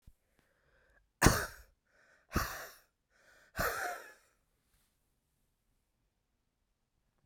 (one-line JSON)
{"exhalation_length": "7.3 s", "exhalation_amplitude": 10873, "exhalation_signal_mean_std_ratio": 0.24, "survey_phase": "beta (2021-08-13 to 2022-03-07)", "age": "45-64", "gender": "Female", "wearing_mask": "No", "symptom_cough_any": true, "symptom_runny_or_blocked_nose": true, "symptom_abdominal_pain": true, "symptom_fatigue": true, "symptom_headache": true, "symptom_change_to_sense_of_smell_or_taste": true, "symptom_loss_of_taste": true, "symptom_onset": "5 days", "smoker_status": "Never smoked", "respiratory_condition_asthma": false, "respiratory_condition_other": false, "recruitment_source": "Test and Trace", "submission_delay": "1 day", "covid_test_result": "Positive", "covid_test_method": "RT-qPCR", "covid_ct_value": 19.2, "covid_ct_gene": "ORF1ab gene", "covid_ct_mean": 19.7, "covid_viral_load": "340000 copies/ml", "covid_viral_load_category": "Low viral load (10K-1M copies/ml)"}